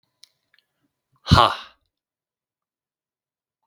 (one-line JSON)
{"exhalation_length": "3.7 s", "exhalation_amplitude": 32766, "exhalation_signal_mean_std_ratio": 0.18, "survey_phase": "beta (2021-08-13 to 2022-03-07)", "age": "45-64", "gender": "Male", "wearing_mask": "No", "symptom_runny_or_blocked_nose": true, "symptom_headache": true, "smoker_status": "Never smoked", "respiratory_condition_asthma": false, "respiratory_condition_other": false, "recruitment_source": "REACT", "submission_delay": "3 days", "covid_test_result": "Negative", "covid_test_method": "RT-qPCR"}